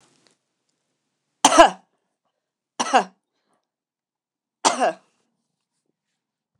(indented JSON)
{
  "three_cough_length": "6.6 s",
  "three_cough_amplitude": 29203,
  "three_cough_signal_mean_std_ratio": 0.22,
  "survey_phase": "beta (2021-08-13 to 2022-03-07)",
  "age": "45-64",
  "gender": "Female",
  "wearing_mask": "No",
  "symptom_runny_or_blocked_nose": true,
  "smoker_status": "Never smoked",
  "respiratory_condition_asthma": false,
  "respiratory_condition_other": false,
  "recruitment_source": "REACT",
  "submission_delay": "1 day",
  "covid_test_result": "Negative",
  "covid_test_method": "RT-qPCR",
  "influenza_a_test_result": "Negative",
  "influenza_b_test_result": "Negative"
}